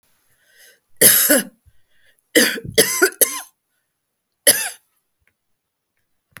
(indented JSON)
{
  "three_cough_length": "6.4 s",
  "three_cough_amplitude": 32768,
  "three_cough_signal_mean_std_ratio": 0.33,
  "survey_phase": "beta (2021-08-13 to 2022-03-07)",
  "age": "65+",
  "gender": "Female",
  "wearing_mask": "No",
  "symptom_none": true,
  "smoker_status": "Never smoked",
  "respiratory_condition_asthma": false,
  "respiratory_condition_other": false,
  "recruitment_source": "REACT",
  "submission_delay": "1 day",
  "covid_test_result": "Negative",
  "covid_test_method": "RT-qPCR",
  "influenza_a_test_result": "Negative",
  "influenza_b_test_result": "Negative"
}